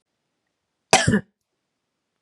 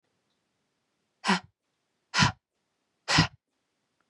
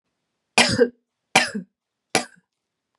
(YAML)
cough_length: 2.2 s
cough_amplitude: 32738
cough_signal_mean_std_ratio: 0.25
exhalation_length: 4.1 s
exhalation_amplitude: 14576
exhalation_signal_mean_std_ratio: 0.26
three_cough_length: 3.0 s
three_cough_amplitude: 32767
three_cough_signal_mean_std_ratio: 0.31
survey_phase: beta (2021-08-13 to 2022-03-07)
age: 18-44
gender: Female
wearing_mask: 'No'
symptom_runny_or_blocked_nose: true
symptom_headache: true
symptom_onset: 5 days
smoker_status: Never smoked
respiratory_condition_asthma: false
respiratory_condition_other: false
recruitment_source: REACT
submission_delay: 20 days
covid_test_result: Negative
covid_test_method: RT-qPCR
influenza_a_test_result: Negative
influenza_b_test_result: Negative